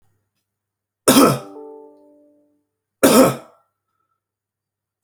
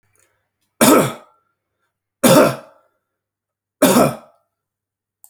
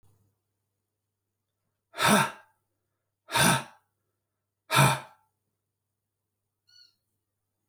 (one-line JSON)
{"cough_length": "5.0 s", "cough_amplitude": 32768, "cough_signal_mean_std_ratio": 0.29, "three_cough_length": "5.3 s", "three_cough_amplitude": 32768, "three_cough_signal_mean_std_ratio": 0.34, "exhalation_length": "7.7 s", "exhalation_amplitude": 14320, "exhalation_signal_mean_std_ratio": 0.27, "survey_phase": "alpha (2021-03-01 to 2021-08-12)", "age": "45-64", "gender": "Male", "wearing_mask": "No", "symptom_none": true, "smoker_status": "Never smoked", "respiratory_condition_asthma": false, "respiratory_condition_other": false, "recruitment_source": "REACT", "submission_delay": "3 days", "covid_test_result": "Negative", "covid_test_method": "RT-qPCR"}